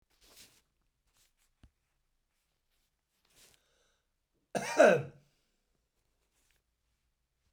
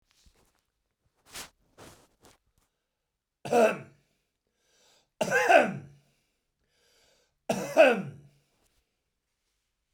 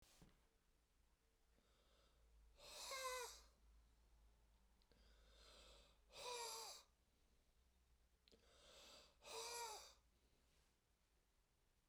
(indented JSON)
{
  "cough_length": "7.5 s",
  "cough_amplitude": 9522,
  "cough_signal_mean_std_ratio": 0.17,
  "three_cough_length": "9.9 s",
  "three_cough_amplitude": 15509,
  "three_cough_signal_mean_std_ratio": 0.27,
  "exhalation_length": "11.9 s",
  "exhalation_amplitude": 404,
  "exhalation_signal_mean_std_ratio": 0.47,
  "survey_phase": "beta (2021-08-13 to 2022-03-07)",
  "age": "65+",
  "gender": "Male",
  "wearing_mask": "No",
  "symptom_none": true,
  "smoker_status": "Ex-smoker",
  "respiratory_condition_asthma": false,
  "respiratory_condition_other": true,
  "recruitment_source": "REACT",
  "submission_delay": "1 day",
  "covid_test_result": "Negative",
  "covid_test_method": "RT-qPCR"
}